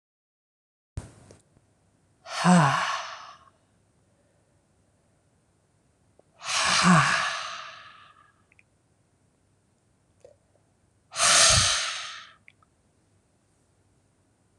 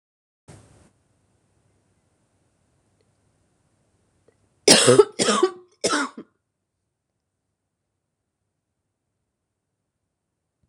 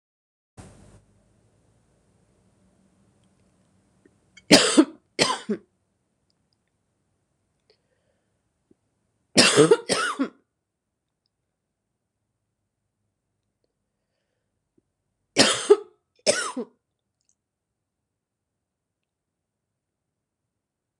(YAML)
exhalation_length: 14.6 s
exhalation_amplitude: 18814
exhalation_signal_mean_std_ratio: 0.34
cough_length: 10.7 s
cough_amplitude: 26028
cough_signal_mean_std_ratio: 0.21
three_cough_length: 21.0 s
three_cough_amplitude: 26028
three_cough_signal_mean_std_ratio: 0.21
survey_phase: beta (2021-08-13 to 2022-03-07)
age: 45-64
gender: Female
wearing_mask: 'No'
symptom_cough_any: true
symptom_runny_or_blocked_nose: true
symptom_abdominal_pain: true
symptom_fatigue: true
symptom_fever_high_temperature: true
symptom_headache: true
symptom_change_to_sense_of_smell_or_taste: true
symptom_onset: 4 days
smoker_status: Never smoked
respiratory_condition_asthma: false
respiratory_condition_other: false
recruitment_source: Test and Trace
submission_delay: 1 day
covid_test_result: Positive
covid_test_method: ePCR